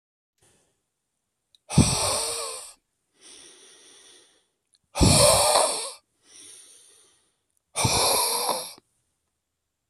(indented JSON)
{
  "exhalation_length": "9.9 s",
  "exhalation_amplitude": 19514,
  "exhalation_signal_mean_std_ratio": 0.4,
  "survey_phase": "beta (2021-08-13 to 2022-03-07)",
  "age": "45-64",
  "gender": "Male",
  "wearing_mask": "No",
  "symptom_cough_any": true,
  "symptom_fatigue": true,
  "symptom_fever_high_temperature": true,
  "symptom_other": true,
  "symptom_onset": "7 days",
  "smoker_status": "Never smoked",
  "respiratory_condition_asthma": false,
  "respiratory_condition_other": false,
  "recruitment_source": "Test and Trace",
  "submission_delay": "2 days",
  "covid_test_result": "Positive",
  "covid_test_method": "RT-qPCR",
  "covid_ct_value": 12.8,
  "covid_ct_gene": "ORF1ab gene",
  "covid_ct_mean": 13.4,
  "covid_viral_load": "41000000 copies/ml",
  "covid_viral_load_category": "High viral load (>1M copies/ml)"
}